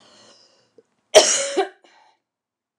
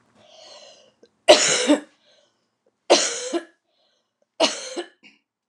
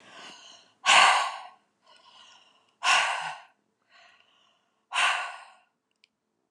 {"cough_length": "2.8 s", "cough_amplitude": 29204, "cough_signal_mean_std_ratio": 0.28, "three_cough_length": "5.5 s", "three_cough_amplitude": 29204, "three_cough_signal_mean_std_ratio": 0.32, "exhalation_length": "6.5 s", "exhalation_amplitude": 17535, "exhalation_signal_mean_std_ratio": 0.35, "survey_phase": "beta (2021-08-13 to 2022-03-07)", "age": "45-64", "gender": "Female", "wearing_mask": "No", "symptom_change_to_sense_of_smell_or_taste": true, "smoker_status": "Never smoked", "respiratory_condition_asthma": false, "respiratory_condition_other": false, "recruitment_source": "REACT", "submission_delay": "2 days", "covid_test_result": "Negative", "covid_test_method": "RT-qPCR"}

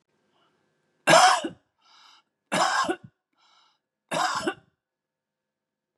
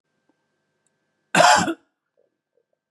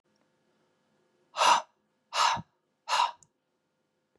{"three_cough_length": "6.0 s", "three_cough_amplitude": 20354, "three_cough_signal_mean_std_ratio": 0.32, "cough_length": "2.9 s", "cough_amplitude": 26960, "cough_signal_mean_std_ratio": 0.28, "exhalation_length": "4.2 s", "exhalation_amplitude": 10772, "exhalation_signal_mean_std_ratio": 0.32, "survey_phase": "beta (2021-08-13 to 2022-03-07)", "age": "45-64", "gender": "Male", "wearing_mask": "No", "symptom_none": true, "smoker_status": "Never smoked", "respiratory_condition_asthma": false, "respiratory_condition_other": false, "recruitment_source": "REACT", "submission_delay": "2 days", "covid_test_result": "Negative", "covid_test_method": "RT-qPCR", "influenza_a_test_result": "Negative", "influenza_b_test_result": "Negative"}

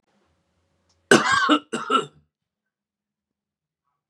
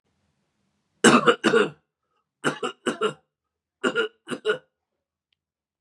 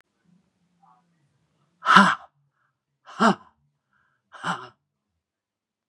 {"cough_length": "4.1 s", "cough_amplitude": 32767, "cough_signal_mean_std_ratio": 0.3, "three_cough_length": "5.8 s", "three_cough_amplitude": 30112, "three_cough_signal_mean_std_ratio": 0.33, "exhalation_length": "5.9 s", "exhalation_amplitude": 32768, "exhalation_signal_mean_std_ratio": 0.22, "survey_phase": "beta (2021-08-13 to 2022-03-07)", "age": "45-64", "gender": "Male", "wearing_mask": "No", "symptom_none": true, "smoker_status": "Never smoked", "respiratory_condition_asthma": false, "respiratory_condition_other": false, "recruitment_source": "REACT", "submission_delay": "6 days", "covid_test_result": "Negative", "covid_test_method": "RT-qPCR", "influenza_a_test_result": "Unknown/Void", "influenza_b_test_result": "Unknown/Void"}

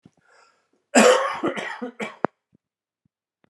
{"cough_length": "3.5 s", "cough_amplitude": 29260, "cough_signal_mean_std_ratio": 0.33, "survey_phase": "alpha (2021-03-01 to 2021-08-12)", "age": "45-64", "gender": "Male", "wearing_mask": "No", "symptom_new_continuous_cough": true, "symptom_abdominal_pain": true, "symptom_fatigue": true, "symptom_fever_high_temperature": true, "symptom_headache": true, "symptom_onset": "3 days", "smoker_status": "Ex-smoker", "respiratory_condition_asthma": false, "respiratory_condition_other": false, "recruitment_source": "Test and Trace", "submission_delay": "2 days", "covid_test_result": "Positive", "covid_test_method": "RT-qPCR", "covid_ct_value": 14.8, "covid_ct_gene": "ORF1ab gene", "covid_ct_mean": 15.1, "covid_viral_load": "11000000 copies/ml", "covid_viral_load_category": "High viral load (>1M copies/ml)"}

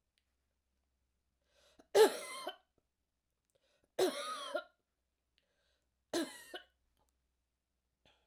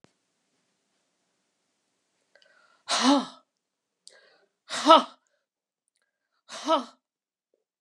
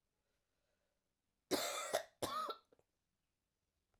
{"three_cough_length": "8.3 s", "three_cough_amplitude": 6772, "three_cough_signal_mean_std_ratio": 0.23, "exhalation_length": "7.8 s", "exhalation_amplitude": 29504, "exhalation_signal_mean_std_ratio": 0.22, "cough_length": "4.0 s", "cough_amplitude": 2511, "cough_signal_mean_std_ratio": 0.35, "survey_phase": "alpha (2021-03-01 to 2021-08-12)", "age": "65+", "gender": "Female", "wearing_mask": "No", "symptom_fatigue": true, "symptom_fever_high_temperature": true, "symptom_change_to_sense_of_smell_or_taste": true, "smoker_status": "Never smoked", "respiratory_condition_asthma": false, "respiratory_condition_other": false, "recruitment_source": "Test and Trace", "submission_delay": "2 days", "covid_test_result": "Positive", "covid_test_method": "RT-qPCR", "covid_ct_value": 16.5, "covid_ct_gene": "ORF1ab gene", "covid_ct_mean": 17.5, "covid_viral_load": "1800000 copies/ml", "covid_viral_load_category": "High viral load (>1M copies/ml)"}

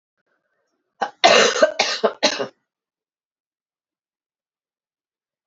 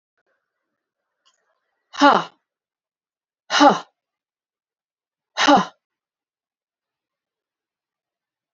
{"cough_length": "5.5 s", "cough_amplitude": 32767, "cough_signal_mean_std_ratio": 0.3, "exhalation_length": "8.5 s", "exhalation_amplitude": 32768, "exhalation_signal_mean_std_ratio": 0.22, "survey_phase": "beta (2021-08-13 to 2022-03-07)", "age": "45-64", "gender": "Female", "wearing_mask": "No", "symptom_cough_any": true, "symptom_onset": "5 days", "smoker_status": "Never smoked", "respiratory_condition_asthma": false, "respiratory_condition_other": false, "recruitment_source": "Test and Trace", "submission_delay": "2 days", "covid_test_result": "Positive", "covid_test_method": "RT-qPCR", "covid_ct_value": 15.4, "covid_ct_gene": "ORF1ab gene", "covid_ct_mean": 16.5, "covid_viral_load": "3900000 copies/ml", "covid_viral_load_category": "High viral load (>1M copies/ml)"}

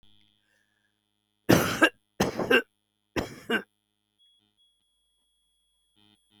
{"cough_length": "6.4 s", "cough_amplitude": 21435, "cough_signal_mean_std_ratio": 0.27, "survey_phase": "beta (2021-08-13 to 2022-03-07)", "age": "65+", "gender": "Female", "wearing_mask": "No", "symptom_none": true, "smoker_status": "Never smoked", "respiratory_condition_asthma": false, "respiratory_condition_other": false, "recruitment_source": "REACT", "submission_delay": "2 days", "covid_test_result": "Negative", "covid_test_method": "RT-qPCR", "influenza_a_test_result": "Unknown/Void", "influenza_b_test_result": "Unknown/Void"}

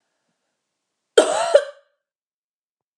{"cough_length": "3.0 s", "cough_amplitude": 32767, "cough_signal_mean_std_ratio": 0.26, "survey_phase": "beta (2021-08-13 to 2022-03-07)", "age": "45-64", "gender": "Female", "wearing_mask": "No", "symptom_none": true, "smoker_status": "Never smoked", "respiratory_condition_asthma": false, "respiratory_condition_other": false, "recruitment_source": "REACT", "submission_delay": "2 days", "covid_test_result": "Negative", "covid_test_method": "RT-qPCR", "influenza_a_test_result": "Negative", "influenza_b_test_result": "Negative"}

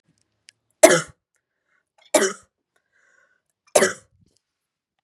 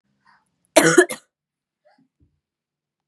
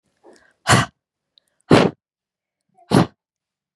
{"three_cough_length": "5.0 s", "three_cough_amplitude": 32768, "three_cough_signal_mean_std_ratio": 0.22, "cough_length": "3.1 s", "cough_amplitude": 32768, "cough_signal_mean_std_ratio": 0.23, "exhalation_length": "3.8 s", "exhalation_amplitude": 32768, "exhalation_signal_mean_std_ratio": 0.28, "survey_phase": "beta (2021-08-13 to 2022-03-07)", "age": "18-44", "gender": "Female", "wearing_mask": "No", "symptom_cough_any": true, "symptom_new_continuous_cough": true, "symptom_sore_throat": true, "symptom_fatigue": true, "symptom_headache": true, "symptom_other": true, "symptom_onset": "2 days", "smoker_status": "Never smoked", "respiratory_condition_asthma": false, "respiratory_condition_other": false, "recruitment_source": "Test and Trace", "submission_delay": "1 day", "covid_test_result": "Positive", "covid_test_method": "RT-qPCR", "covid_ct_value": 20.3, "covid_ct_gene": "N gene"}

